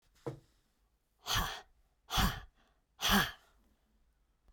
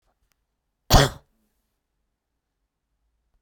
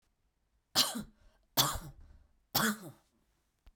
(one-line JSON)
{"exhalation_length": "4.5 s", "exhalation_amplitude": 5115, "exhalation_signal_mean_std_ratio": 0.35, "cough_length": "3.4 s", "cough_amplitude": 32767, "cough_signal_mean_std_ratio": 0.17, "three_cough_length": "3.8 s", "three_cough_amplitude": 8875, "three_cough_signal_mean_std_ratio": 0.34, "survey_phase": "beta (2021-08-13 to 2022-03-07)", "age": "45-64", "gender": "Female", "wearing_mask": "No", "symptom_runny_or_blocked_nose": true, "symptom_diarrhoea": true, "smoker_status": "Never smoked", "respiratory_condition_asthma": false, "respiratory_condition_other": false, "recruitment_source": "Test and Trace", "submission_delay": "1 day", "covid_test_result": "Positive", "covid_test_method": "RT-qPCR", "covid_ct_value": 22.0, "covid_ct_gene": "N gene", "covid_ct_mean": 23.7, "covid_viral_load": "17000 copies/ml", "covid_viral_load_category": "Low viral load (10K-1M copies/ml)"}